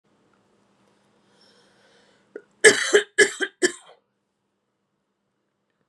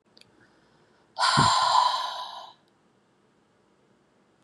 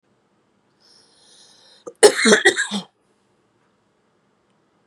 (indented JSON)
{
  "three_cough_length": "5.9 s",
  "three_cough_amplitude": 32590,
  "three_cough_signal_mean_std_ratio": 0.22,
  "exhalation_length": "4.4 s",
  "exhalation_amplitude": 14488,
  "exhalation_signal_mean_std_ratio": 0.41,
  "cough_length": "4.9 s",
  "cough_amplitude": 32768,
  "cough_signal_mean_std_ratio": 0.25,
  "survey_phase": "beta (2021-08-13 to 2022-03-07)",
  "age": "45-64",
  "gender": "Female",
  "wearing_mask": "No",
  "symptom_change_to_sense_of_smell_or_taste": true,
  "smoker_status": "Never smoked",
  "respiratory_condition_asthma": false,
  "respiratory_condition_other": false,
  "recruitment_source": "REACT",
  "submission_delay": "2 days",
  "covid_test_result": "Negative",
  "covid_test_method": "RT-qPCR",
  "influenza_a_test_result": "Negative",
  "influenza_b_test_result": "Negative"
}